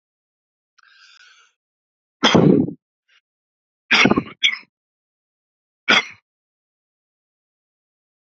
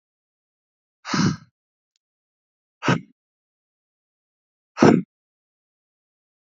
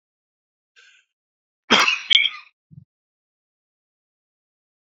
three_cough_length: 8.4 s
three_cough_amplitude: 31406
three_cough_signal_mean_std_ratio: 0.26
exhalation_length: 6.5 s
exhalation_amplitude: 31425
exhalation_signal_mean_std_ratio: 0.22
cough_length: 4.9 s
cough_amplitude: 29101
cough_signal_mean_std_ratio: 0.23
survey_phase: beta (2021-08-13 to 2022-03-07)
age: 18-44
gender: Male
wearing_mask: 'No'
symptom_cough_any: true
symptom_runny_or_blocked_nose: true
symptom_fatigue: true
symptom_headache: true
symptom_loss_of_taste: true
symptom_onset: 2 days
smoker_status: Never smoked
respiratory_condition_asthma: false
respiratory_condition_other: false
recruitment_source: Test and Trace
submission_delay: 1 day
covid_test_result: Positive
covid_test_method: RT-qPCR
covid_ct_value: 17.2
covid_ct_gene: ORF1ab gene
covid_ct_mean: 17.7
covid_viral_load: 1600000 copies/ml
covid_viral_load_category: High viral load (>1M copies/ml)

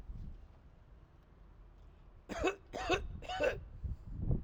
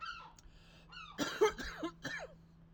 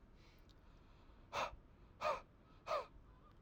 three_cough_length: 4.4 s
three_cough_amplitude: 4027
three_cough_signal_mean_std_ratio: 0.58
cough_length: 2.7 s
cough_amplitude: 3943
cough_signal_mean_std_ratio: 0.47
exhalation_length: 3.4 s
exhalation_amplitude: 1297
exhalation_signal_mean_std_ratio: 0.45
survey_phase: alpha (2021-03-01 to 2021-08-12)
age: 18-44
gender: Male
wearing_mask: 'No'
symptom_none: true
smoker_status: Never smoked
respiratory_condition_asthma: false
respiratory_condition_other: false
recruitment_source: REACT
submission_delay: 1 day
covid_test_result: Negative
covid_test_method: RT-qPCR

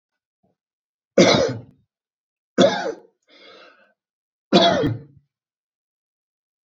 three_cough_length: 6.7 s
three_cough_amplitude: 26844
three_cough_signal_mean_std_ratio: 0.32
survey_phase: beta (2021-08-13 to 2022-03-07)
age: 18-44
gender: Male
wearing_mask: 'No'
symptom_none: true
smoker_status: Never smoked
respiratory_condition_asthma: false
respiratory_condition_other: false
recruitment_source: REACT
submission_delay: 5 days
covid_test_result: Negative
covid_test_method: RT-qPCR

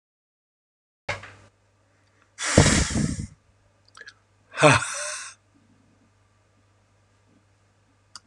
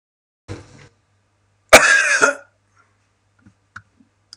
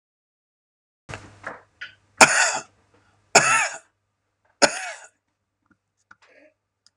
exhalation_length: 8.3 s
exhalation_amplitude: 32104
exhalation_signal_mean_std_ratio: 0.29
cough_length: 4.4 s
cough_amplitude: 32768
cough_signal_mean_std_ratio: 0.28
three_cough_length: 7.0 s
three_cough_amplitude: 32768
three_cough_signal_mean_std_ratio: 0.26
survey_phase: beta (2021-08-13 to 2022-03-07)
age: 45-64
gender: Male
wearing_mask: 'No'
symptom_none: true
smoker_status: Ex-smoker
respiratory_condition_asthma: false
respiratory_condition_other: false
recruitment_source: REACT
submission_delay: 1 day
covid_test_result: Negative
covid_test_method: RT-qPCR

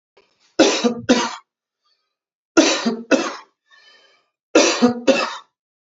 three_cough_length: 5.8 s
three_cough_amplitude: 29751
three_cough_signal_mean_std_ratio: 0.43
survey_phase: beta (2021-08-13 to 2022-03-07)
age: 45-64
gender: Male
wearing_mask: 'No'
symptom_none: true
smoker_status: Ex-smoker
respiratory_condition_asthma: false
respiratory_condition_other: false
recruitment_source: REACT
submission_delay: 1 day
covid_test_result: Negative
covid_test_method: RT-qPCR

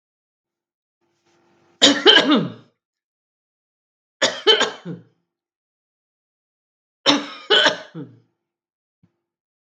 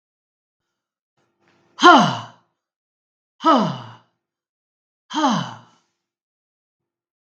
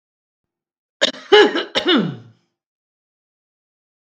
three_cough_length: 9.7 s
three_cough_amplitude: 32768
three_cough_signal_mean_std_ratio: 0.3
exhalation_length: 7.3 s
exhalation_amplitude: 32768
exhalation_signal_mean_std_ratio: 0.26
cough_length: 4.0 s
cough_amplitude: 32768
cough_signal_mean_std_ratio: 0.32
survey_phase: beta (2021-08-13 to 2022-03-07)
age: 65+
gender: Female
wearing_mask: 'No'
symptom_runny_or_blocked_nose: true
symptom_headache: true
smoker_status: Ex-smoker
respiratory_condition_asthma: true
respiratory_condition_other: false
recruitment_source: REACT
submission_delay: 2 days
covid_test_result: Positive
covid_test_method: RT-qPCR
covid_ct_value: 27.0
covid_ct_gene: E gene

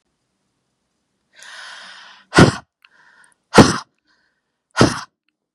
exhalation_length: 5.5 s
exhalation_amplitude: 32768
exhalation_signal_mean_std_ratio: 0.24
survey_phase: beta (2021-08-13 to 2022-03-07)
age: 18-44
gender: Female
wearing_mask: 'No'
symptom_none: true
symptom_onset: 4 days
smoker_status: Ex-smoker
respiratory_condition_asthma: false
respiratory_condition_other: false
recruitment_source: REACT
submission_delay: 1 day
covid_test_result: Negative
covid_test_method: RT-qPCR
influenza_a_test_result: Negative
influenza_b_test_result: Negative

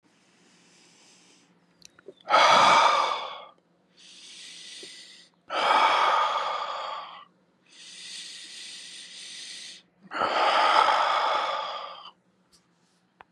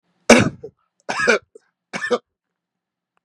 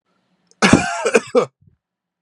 exhalation_length: 13.3 s
exhalation_amplitude: 15907
exhalation_signal_mean_std_ratio: 0.48
three_cough_length: 3.2 s
three_cough_amplitude: 32768
three_cough_signal_mean_std_ratio: 0.31
cough_length: 2.2 s
cough_amplitude: 32768
cough_signal_mean_std_ratio: 0.38
survey_phase: beta (2021-08-13 to 2022-03-07)
age: 45-64
gender: Male
wearing_mask: 'No'
symptom_none: true
smoker_status: Never smoked
respiratory_condition_asthma: false
respiratory_condition_other: false
recruitment_source: REACT
submission_delay: 1 day
covid_test_result: Negative
covid_test_method: RT-qPCR
influenza_a_test_result: Negative
influenza_b_test_result: Negative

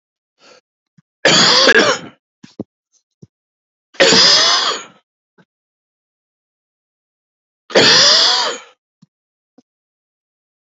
three_cough_length: 10.7 s
three_cough_amplitude: 32402
three_cough_signal_mean_std_ratio: 0.39
survey_phase: beta (2021-08-13 to 2022-03-07)
age: 45-64
gender: Male
wearing_mask: 'No'
symptom_cough_any: true
symptom_runny_or_blocked_nose: true
symptom_shortness_of_breath: true
symptom_sore_throat: true
symptom_fatigue: true
symptom_onset: 2 days
smoker_status: Never smoked
respiratory_condition_asthma: false
respiratory_condition_other: false
recruitment_source: Test and Trace
submission_delay: 1 day
covid_test_result: Positive
covid_test_method: ePCR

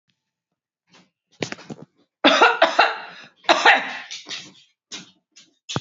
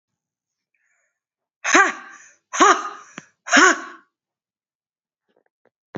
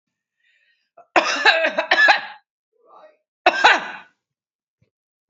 three_cough_length: 5.8 s
three_cough_amplitude: 28545
three_cough_signal_mean_std_ratio: 0.35
exhalation_length: 6.0 s
exhalation_amplitude: 30012
exhalation_signal_mean_std_ratio: 0.29
cough_length: 5.3 s
cough_amplitude: 29773
cough_signal_mean_std_ratio: 0.37
survey_phase: beta (2021-08-13 to 2022-03-07)
age: 45-64
gender: Female
wearing_mask: 'No'
symptom_none: true
symptom_onset: 4 days
smoker_status: Never smoked
respiratory_condition_asthma: true
respiratory_condition_other: false
recruitment_source: Test and Trace
submission_delay: 3 days
covid_test_result: Negative
covid_test_method: RT-qPCR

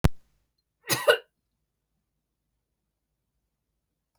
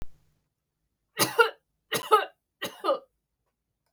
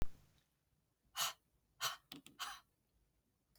cough_length: 4.2 s
cough_amplitude: 23083
cough_signal_mean_std_ratio: 0.2
three_cough_length: 3.9 s
three_cough_amplitude: 19648
three_cough_signal_mean_std_ratio: 0.31
exhalation_length: 3.6 s
exhalation_amplitude: 1974
exhalation_signal_mean_std_ratio: 0.3
survey_phase: beta (2021-08-13 to 2022-03-07)
age: 45-64
gender: Female
wearing_mask: 'No'
symptom_none: true
smoker_status: Never smoked
respiratory_condition_asthma: false
respiratory_condition_other: false
recruitment_source: REACT
submission_delay: 2 days
covid_test_result: Negative
covid_test_method: RT-qPCR
influenza_a_test_result: Negative
influenza_b_test_result: Negative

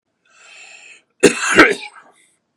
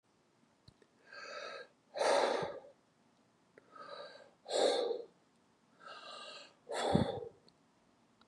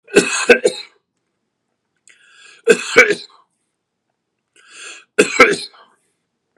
cough_length: 2.6 s
cough_amplitude: 32768
cough_signal_mean_std_ratio: 0.32
exhalation_length: 8.3 s
exhalation_amplitude: 5827
exhalation_signal_mean_std_ratio: 0.42
three_cough_length: 6.6 s
three_cough_amplitude: 32768
three_cough_signal_mean_std_ratio: 0.31
survey_phase: beta (2021-08-13 to 2022-03-07)
age: 45-64
gender: Male
wearing_mask: 'No'
symptom_none: true
smoker_status: Ex-smoker
respiratory_condition_asthma: false
respiratory_condition_other: false
recruitment_source: REACT
submission_delay: 1 day
covid_test_result: Negative
covid_test_method: RT-qPCR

